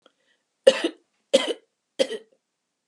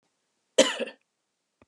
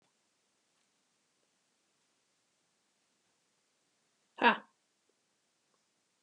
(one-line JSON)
{"three_cough_length": "2.9 s", "three_cough_amplitude": 30696, "three_cough_signal_mean_std_ratio": 0.26, "cough_length": "1.7 s", "cough_amplitude": 19927, "cough_signal_mean_std_ratio": 0.24, "exhalation_length": "6.2 s", "exhalation_amplitude": 11282, "exhalation_signal_mean_std_ratio": 0.12, "survey_phase": "alpha (2021-03-01 to 2021-08-12)", "age": "65+", "gender": "Female", "wearing_mask": "No", "symptom_none": true, "smoker_status": "Never smoked", "recruitment_source": "REACT", "submission_delay": "11 days", "covid_test_result": "Negative", "covid_test_method": "RT-qPCR"}